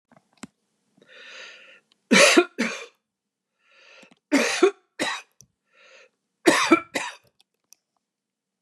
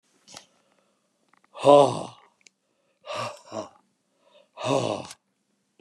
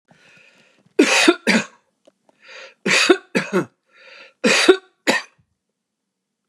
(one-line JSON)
{"three_cough_length": "8.6 s", "three_cough_amplitude": 25473, "three_cough_signal_mean_std_ratio": 0.31, "exhalation_length": "5.8 s", "exhalation_amplitude": 28293, "exhalation_signal_mean_std_ratio": 0.27, "cough_length": "6.5 s", "cough_amplitude": 32715, "cough_signal_mean_std_ratio": 0.38, "survey_phase": "beta (2021-08-13 to 2022-03-07)", "age": "65+", "gender": "Male", "wearing_mask": "No", "symptom_none": true, "smoker_status": "Ex-smoker", "respiratory_condition_asthma": false, "respiratory_condition_other": false, "recruitment_source": "REACT", "submission_delay": "2 days", "covid_test_result": "Negative", "covid_test_method": "RT-qPCR"}